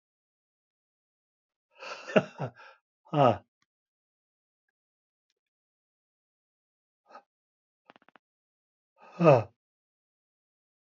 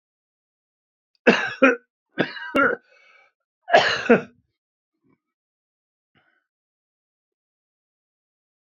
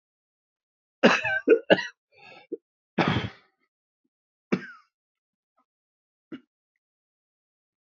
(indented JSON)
{
  "exhalation_length": "10.9 s",
  "exhalation_amplitude": 13733,
  "exhalation_signal_mean_std_ratio": 0.18,
  "three_cough_length": "8.6 s",
  "three_cough_amplitude": 27803,
  "three_cough_signal_mean_std_ratio": 0.26,
  "cough_length": "7.9 s",
  "cough_amplitude": 23700,
  "cough_signal_mean_std_ratio": 0.25,
  "survey_phase": "beta (2021-08-13 to 2022-03-07)",
  "age": "65+",
  "gender": "Male",
  "wearing_mask": "No",
  "symptom_cough_any": true,
  "symptom_runny_or_blocked_nose": true,
  "symptom_sore_throat": true,
  "symptom_fatigue": true,
  "symptom_onset": "5 days",
  "smoker_status": "Never smoked",
  "respiratory_condition_asthma": false,
  "respiratory_condition_other": false,
  "recruitment_source": "Test and Trace",
  "submission_delay": "2 days",
  "covid_test_result": "Negative",
  "covid_test_method": "RT-qPCR"
}